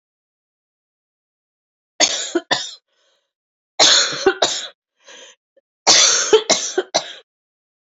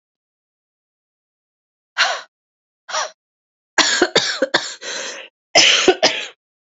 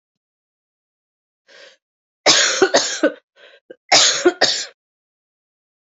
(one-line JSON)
{"three_cough_length": "7.9 s", "three_cough_amplitude": 32768, "three_cough_signal_mean_std_ratio": 0.38, "exhalation_length": "6.7 s", "exhalation_amplitude": 31165, "exhalation_signal_mean_std_ratio": 0.39, "cough_length": "5.8 s", "cough_amplitude": 30446, "cough_signal_mean_std_ratio": 0.37, "survey_phase": "beta (2021-08-13 to 2022-03-07)", "age": "18-44", "gender": "Female", "wearing_mask": "No", "symptom_cough_any": true, "symptom_runny_or_blocked_nose": true, "symptom_shortness_of_breath": true, "symptom_sore_throat": true, "symptom_abdominal_pain": true, "symptom_fatigue": true, "symptom_headache": true, "symptom_other": true, "symptom_onset": "5 days", "smoker_status": "Never smoked", "respiratory_condition_asthma": false, "respiratory_condition_other": false, "recruitment_source": "Test and Trace", "submission_delay": "2 days", "covid_test_result": "Positive", "covid_test_method": "RT-qPCR", "covid_ct_value": 18.8, "covid_ct_gene": "ORF1ab gene"}